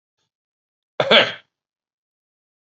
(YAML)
cough_length: 2.6 s
cough_amplitude: 29344
cough_signal_mean_std_ratio: 0.24
survey_phase: beta (2021-08-13 to 2022-03-07)
age: 45-64
gender: Male
wearing_mask: 'No'
symptom_none: true
smoker_status: Current smoker (1 to 10 cigarettes per day)
respiratory_condition_asthma: false
respiratory_condition_other: false
recruitment_source: REACT
submission_delay: 1 day
covid_test_result: Negative
covid_test_method: RT-qPCR